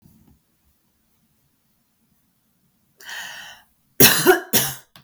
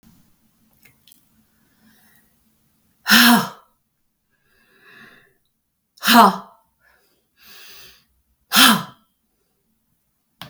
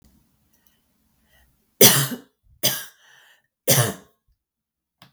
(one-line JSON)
{"cough_length": "5.0 s", "cough_amplitude": 32768, "cough_signal_mean_std_ratio": 0.27, "exhalation_length": "10.5 s", "exhalation_amplitude": 32768, "exhalation_signal_mean_std_ratio": 0.25, "three_cough_length": "5.1 s", "three_cough_amplitude": 32768, "three_cough_signal_mean_std_ratio": 0.26, "survey_phase": "beta (2021-08-13 to 2022-03-07)", "age": "45-64", "gender": "Female", "wearing_mask": "No", "symptom_none": true, "smoker_status": "Never smoked", "respiratory_condition_asthma": false, "respiratory_condition_other": false, "recruitment_source": "REACT", "submission_delay": "1 day", "covid_test_result": "Negative", "covid_test_method": "RT-qPCR"}